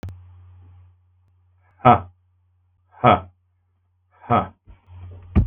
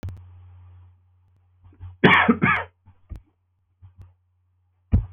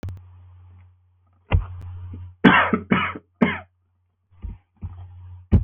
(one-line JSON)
{"exhalation_length": "5.5 s", "exhalation_amplitude": 32766, "exhalation_signal_mean_std_ratio": 0.27, "cough_length": "5.1 s", "cough_amplitude": 32766, "cough_signal_mean_std_ratio": 0.31, "three_cough_length": "5.6 s", "three_cough_amplitude": 32766, "three_cough_signal_mean_std_ratio": 0.37, "survey_phase": "beta (2021-08-13 to 2022-03-07)", "age": "45-64", "gender": "Male", "wearing_mask": "No", "symptom_cough_any": true, "symptom_sore_throat": true, "symptom_abdominal_pain": true, "symptom_fatigue": true, "symptom_headache": true, "symptom_onset": "3 days", "smoker_status": "Ex-smoker", "respiratory_condition_asthma": false, "respiratory_condition_other": false, "recruitment_source": "Test and Trace", "submission_delay": "1 day", "covid_test_result": "Positive", "covid_test_method": "ePCR"}